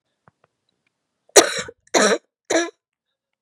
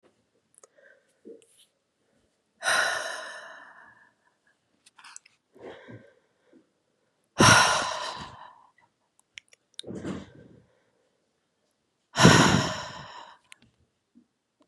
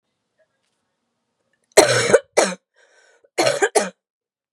{"three_cough_length": "3.4 s", "three_cough_amplitude": 32768, "three_cough_signal_mean_std_ratio": 0.3, "exhalation_length": "14.7 s", "exhalation_amplitude": 24853, "exhalation_signal_mean_std_ratio": 0.27, "cough_length": "4.5 s", "cough_amplitude": 32768, "cough_signal_mean_std_ratio": 0.33, "survey_phase": "beta (2021-08-13 to 2022-03-07)", "age": "18-44", "gender": "Female", "wearing_mask": "No", "symptom_cough_any": true, "symptom_runny_or_blocked_nose": true, "symptom_shortness_of_breath": true, "symptom_sore_throat": true, "symptom_fatigue": true, "symptom_onset": "3 days", "smoker_status": "Never smoked", "respiratory_condition_asthma": false, "respiratory_condition_other": false, "recruitment_source": "Test and Trace", "submission_delay": "2 days", "covid_test_result": "Positive", "covid_test_method": "RT-qPCR", "covid_ct_value": 21.4, "covid_ct_gene": "ORF1ab gene"}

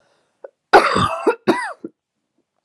{"cough_length": "2.6 s", "cough_amplitude": 32768, "cough_signal_mean_std_ratio": 0.38, "survey_phase": "alpha (2021-03-01 to 2021-08-12)", "age": "18-44", "gender": "Female", "wearing_mask": "No", "symptom_cough_any": true, "symptom_onset": "4 days", "smoker_status": "Never smoked", "respiratory_condition_asthma": false, "respiratory_condition_other": false, "recruitment_source": "Test and Trace", "submission_delay": "2 days", "covid_test_result": "Positive", "covid_test_method": "RT-qPCR", "covid_ct_value": 19.1, "covid_ct_gene": "N gene", "covid_ct_mean": 19.2, "covid_viral_load": "490000 copies/ml", "covid_viral_load_category": "Low viral load (10K-1M copies/ml)"}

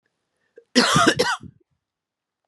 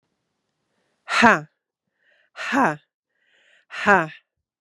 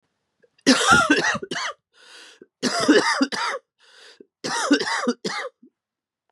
{"cough_length": "2.5 s", "cough_amplitude": 29199, "cough_signal_mean_std_ratio": 0.38, "exhalation_length": "4.6 s", "exhalation_amplitude": 32767, "exhalation_signal_mean_std_ratio": 0.29, "three_cough_length": "6.3 s", "three_cough_amplitude": 24623, "three_cough_signal_mean_std_ratio": 0.5, "survey_phase": "beta (2021-08-13 to 2022-03-07)", "age": "45-64", "gender": "Female", "wearing_mask": "No", "symptom_cough_any": true, "symptom_new_continuous_cough": true, "symptom_runny_or_blocked_nose": true, "symptom_shortness_of_breath": true, "symptom_sore_throat": true, "symptom_fatigue": true, "symptom_fever_high_temperature": true, "symptom_headache": true, "symptom_onset": "5 days", "smoker_status": "Never smoked", "respiratory_condition_asthma": true, "respiratory_condition_other": false, "recruitment_source": "Test and Trace", "submission_delay": "1 day", "covid_test_result": "Positive", "covid_test_method": "RT-qPCR", "covid_ct_value": 14.6, "covid_ct_gene": "ORF1ab gene", "covid_ct_mean": 14.9, "covid_viral_load": "13000000 copies/ml", "covid_viral_load_category": "High viral load (>1M copies/ml)"}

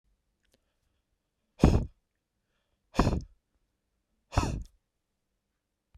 {"exhalation_length": "6.0 s", "exhalation_amplitude": 15802, "exhalation_signal_mean_std_ratio": 0.24, "survey_phase": "beta (2021-08-13 to 2022-03-07)", "age": "45-64", "gender": "Male", "wearing_mask": "No", "symptom_none": true, "symptom_onset": "7 days", "smoker_status": "Never smoked", "respiratory_condition_asthma": false, "respiratory_condition_other": false, "recruitment_source": "REACT", "submission_delay": "3 days", "covid_test_result": "Negative", "covid_test_method": "RT-qPCR"}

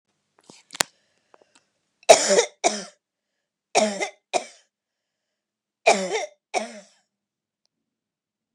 {"three_cough_length": "8.5 s", "three_cough_amplitude": 29204, "three_cough_signal_mean_std_ratio": 0.26, "survey_phase": "beta (2021-08-13 to 2022-03-07)", "age": "45-64", "gender": "Female", "wearing_mask": "No", "symptom_runny_or_blocked_nose": true, "smoker_status": "Never smoked", "respiratory_condition_asthma": false, "respiratory_condition_other": false, "recruitment_source": "Test and Trace", "submission_delay": "2 days", "covid_test_result": "Positive", "covid_test_method": "LFT"}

